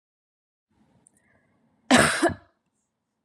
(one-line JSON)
{"cough_length": "3.2 s", "cough_amplitude": 24249, "cough_signal_mean_std_ratio": 0.27, "survey_phase": "beta (2021-08-13 to 2022-03-07)", "age": "18-44", "gender": "Female", "wearing_mask": "No", "symptom_none": true, "smoker_status": "Never smoked", "respiratory_condition_asthma": false, "respiratory_condition_other": false, "recruitment_source": "REACT", "submission_delay": "2 days", "covid_test_result": "Negative", "covid_test_method": "RT-qPCR", "influenza_a_test_result": "Negative", "influenza_b_test_result": "Negative"}